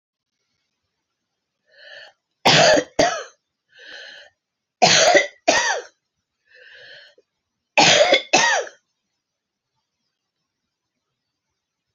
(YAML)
three_cough_length: 11.9 s
three_cough_amplitude: 32768
three_cough_signal_mean_std_ratio: 0.34
survey_phase: beta (2021-08-13 to 2022-03-07)
age: 45-64
gender: Female
wearing_mask: 'No'
symptom_cough_any: true
symptom_runny_or_blocked_nose: true
symptom_diarrhoea: true
symptom_fatigue: true
symptom_headache: true
symptom_change_to_sense_of_smell_or_taste: true
symptom_loss_of_taste: true
symptom_onset: 5 days
smoker_status: Ex-smoker
respiratory_condition_asthma: false
respiratory_condition_other: false
recruitment_source: Test and Trace
submission_delay: 2 days
covid_test_result: Positive
covid_test_method: RT-qPCR